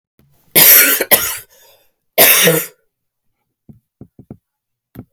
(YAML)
three_cough_length: 5.1 s
three_cough_amplitude: 32768
three_cough_signal_mean_std_ratio: 0.38
survey_phase: beta (2021-08-13 to 2022-03-07)
age: 45-64
gender: Female
wearing_mask: 'No'
symptom_new_continuous_cough: true
symptom_runny_or_blocked_nose: true
symptom_shortness_of_breath: true
symptom_sore_throat: true
symptom_fatigue: true
symptom_fever_high_temperature: true
symptom_headache: true
symptom_other: true
symptom_onset: 6 days
smoker_status: Ex-smoker
respiratory_condition_asthma: true
respiratory_condition_other: false
recruitment_source: Test and Trace
submission_delay: 5 days
covid_test_result: Positive
covid_test_method: ePCR